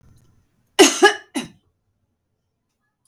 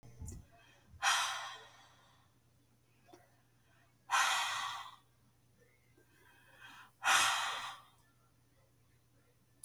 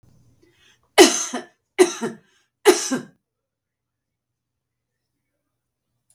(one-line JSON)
{"cough_length": "3.1 s", "cough_amplitude": 32768, "cough_signal_mean_std_ratio": 0.24, "exhalation_length": "9.6 s", "exhalation_amplitude": 5860, "exhalation_signal_mean_std_ratio": 0.38, "three_cough_length": "6.1 s", "three_cough_amplitude": 32768, "three_cough_signal_mean_std_ratio": 0.24, "survey_phase": "beta (2021-08-13 to 2022-03-07)", "age": "65+", "gender": "Female", "wearing_mask": "No", "symptom_none": true, "smoker_status": "Ex-smoker", "respiratory_condition_asthma": false, "respiratory_condition_other": false, "recruitment_source": "REACT", "submission_delay": "1 day", "covid_test_result": "Negative", "covid_test_method": "RT-qPCR", "influenza_a_test_result": "Negative", "influenza_b_test_result": "Negative"}